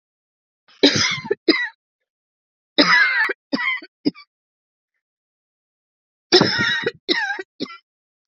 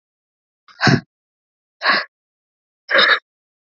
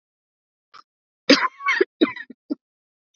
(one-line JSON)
{"three_cough_length": "8.3 s", "three_cough_amplitude": 31962, "three_cough_signal_mean_std_ratio": 0.4, "exhalation_length": "3.7 s", "exhalation_amplitude": 29760, "exhalation_signal_mean_std_ratio": 0.33, "cough_length": "3.2 s", "cough_amplitude": 29325, "cough_signal_mean_std_ratio": 0.29, "survey_phase": "beta (2021-08-13 to 2022-03-07)", "age": "18-44", "gender": "Female", "wearing_mask": "No", "symptom_cough_any": true, "symptom_new_continuous_cough": true, "symptom_runny_or_blocked_nose": true, "symptom_shortness_of_breath": true, "symptom_sore_throat": true, "symptom_fatigue": true, "symptom_fever_high_temperature": true, "symptom_headache": true, "symptom_onset": "3 days", "smoker_status": "Never smoked", "respiratory_condition_asthma": true, "respiratory_condition_other": false, "recruitment_source": "Test and Trace", "submission_delay": "2 days", "covid_test_result": "Positive", "covid_test_method": "ePCR"}